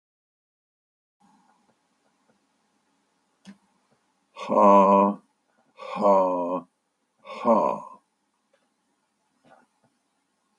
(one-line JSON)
{"exhalation_length": "10.6 s", "exhalation_amplitude": 16973, "exhalation_signal_mean_std_ratio": 0.31, "survey_phase": "beta (2021-08-13 to 2022-03-07)", "age": "65+", "gender": "Male", "wearing_mask": "No", "symptom_cough_any": true, "symptom_runny_or_blocked_nose": true, "symptom_sore_throat": true, "smoker_status": "Ex-smoker", "respiratory_condition_asthma": false, "respiratory_condition_other": false, "recruitment_source": "Test and Trace", "submission_delay": "1 day", "covid_test_result": "Positive", "covid_test_method": "LFT"}